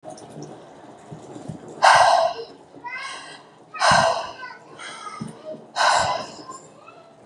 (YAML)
exhalation_length: 7.3 s
exhalation_amplitude: 29416
exhalation_signal_mean_std_ratio: 0.46
survey_phase: beta (2021-08-13 to 2022-03-07)
age: 18-44
gender: Female
wearing_mask: 'No'
symptom_none: true
smoker_status: Never smoked
respiratory_condition_asthma: false
respiratory_condition_other: false
recruitment_source: REACT
submission_delay: 3 days
covid_test_result: Negative
covid_test_method: RT-qPCR
influenza_a_test_result: Negative
influenza_b_test_result: Negative